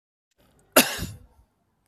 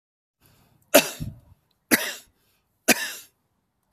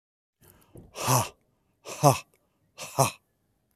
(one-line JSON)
{"cough_length": "1.9 s", "cough_amplitude": 32767, "cough_signal_mean_std_ratio": 0.23, "three_cough_length": "3.9 s", "three_cough_amplitude": 30073, "three_cough_signal_mean_std_ratio": 0.25, "exhalation_length": "3.8 s", "exhalation_amplitude": 22863, "exhalation_signal_mean_std_ratio": 0.3, "survey_phase": "beta (2021-08-13 to 2022-03-07)", "age": "65+", "gender": "Male", "wearing_mask": "No", "symptom_none": true, "smoker_status": "Never smoked", "respiratory_condition_asthma": false, "respiratory_condition_other": false, "recruitment_source": "REACT", "submission_delay": "1 day", "covid_test_result": "Negative", "covid_test_method": "RT-qPCR"}